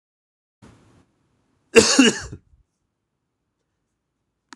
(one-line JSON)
{"cough_length": "4.6 s", "cough_amplitude": 26028, "cough_signal_mean_std_ratio": 0.22, "survey_phase": "beta (2021-08-13 to 2022-03-07)", "age": "45-64", "gender": "Male", "wearing_mask": "No", "symptom_cough_any": true, "symptom_sore_throat": true, "symptom_fatigue": true, "smoker_status": "Never smoked", "respiratory_condition_asthma": false, "respiratory_condition_other": false, "recruitment_source": "Test and Trace", "submission_delay": "2 days", "covid_test_result": "Positive", "covid_test_method": "RT-qPCR", "covid_ct_value": 18.4, "covid_ct_gene": "ORF1ab gene", "covid_ct_mean": 18.9, "covid_viral_load": "610000 copies/ml", "covid_viral_load_category": "Low viral load (10K-1M copies/ml)"}